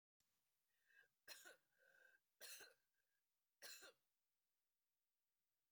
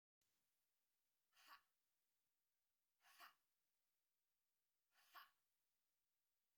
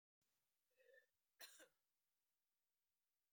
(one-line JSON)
{"three_cough_length": "5.7 s", "three_cough_amplitude": 171, "three_cough_signal_mean_std_ratio": 0.38, "exhalation_length": "6.6 s", "exhalation_amplitude": 109, "exhalation_signal_mean_std_ratio": 0.32, "cough_length": "3.3 s", "cough_amplitude": 145, "cough_signal_mean_std_ratio": 0.32, "survey_phase": "beta (2021-08-13 to 2022-03-07)", "age": "45-64", "gender": "Female", "wearing_mask": "No", "symptom_cough_any": true, "symptom_runny_or_blocked_nose": true, "symptom_shortness_of_breath": true, "symptom_fatigue": true, "symptom_headache": true, "smoker_status": "Never smoked", "respiratory_condition_asthma": false, "respiratory_condition_other": false, "recruitment_source": "Test and Trace", "submission_delay": "2 days", "covid_test_result": "Positive", "covid_test_method": "RT-qPCR", "covid_ct_value": 20.0, "covid_ct_gene": "N gene"}